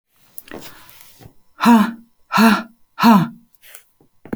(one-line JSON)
{"exhalation_length": "4.4 s", "exhalation_amplitude": 28897, "exhalation_signal_mean_std_ratio": 0.39, "survey_phase": "beta (2021-08-13 to 2022-03-07)", "age": "45-64", "gender": "Female", "wearing_mask": "No", "symptom_none": true, "smoker_status": "Never smoked", "respiratory_condition_asthma": false, "respiratory_condition_other": false, "recruitment_source": "REACT", "submission_delay": "3 days", "covid_test_result": "Negative", "covid_test_method": "RT-qPCR"}